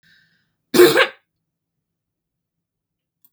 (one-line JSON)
{"cough_length": "3.3 s", "cough_amplitude": 32768, "cough_signal_mean_std_ratio": 0.24, "survey_phase": "beta (2021-08-13 to 2022-03-07)", "age": "45-64", "gender": "Female", "wearing_mask": "No", "symptom_runny_or_blocked_nose": true, "smoker_status": "Never smoked", "respiratory_condition_asthma": false, "respiratory_condition_other": false, "recruitment_source": "REACT", "submission_delay": "0 days", "covid_test_result": "Negative", "covid_test_method": "RT-qPCR", "influenza_a_test_result": "Unknown/Void", "influenza_b_test_result": "Unknown/Void"}